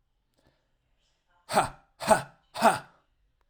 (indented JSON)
{
  "exhalation_length": "3.5 s",
  "exhalation_amplitude": 17981,
  "exhalation_signal_mean_std_ratio": 0.28,
  "survey_phase": "alpha (2021-03-01 to 2021-08-12)",
  "age": "18-44",
  "gender": "Male",
  "wearing_mask": "No",
  "symptom_none": true,
  "smoker_status": "Never smoked",
  "respiratory_condition_asthma": false,
  "respiratory_condition_other": false,
  "recruitment_source": "REACT",
  "submission_delay": "2 days",
  "covid_test_result": "Negative",
  "covid_test_method": "RT-qPCR"
}